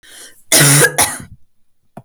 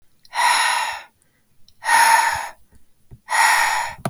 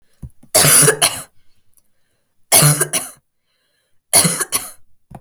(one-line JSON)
{"cough_length": "2.0 s", "cough_amplitude": 32768, "cough_signal_mean_std_ratio": 0.47, "exhalation_length": "4.1 s", "exhalation_amplitude": 29387, "exhalation_signal_mean_std_ratio": 0.6, "three_cough_length": "5.2 s", "three_cough_amplitude": 32768, "three_cough_signal_mean_std_ratio": 0.42, "survey_phase": "beta (2021-08-13 to 2022-03-07)", "age": "18-44", "gender": "Female", "wearing_mask": "No", "symptom_none": true, "smoker_status": "Never smoked", "respiratory_condition_asthma": false, "respiratory_condition_other": false, "recruitment_source": "REACT", "submission_delay": "1 day", "covid_test_result": "Negative", "covid_test_method": "RT-qPCR", "influenza_a_test_result": "Negative", "influenza_b_test_result": "Negative"}